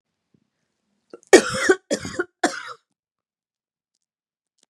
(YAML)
three_cough_length: 4.7 s
three_cough_amplitude: 32768
three_cough_signal_mean_std_ratio: 0.23
survey_phase: beta (2021-08-13 to 2022-03-07)
age: 18-44
gender: Female
wearing_mask: 'No'
symptom_none: true
smoker_status: Never smoked
respiratory_condition_asthma: false
respiratory_condition_other: false
recruitment_source: REACT
submission_delay: 2 days
covid_test_result: Negative
covid_test_method: RT-qPCR
influenza_a_test_result: Negative
influenza_b_test_result: Negative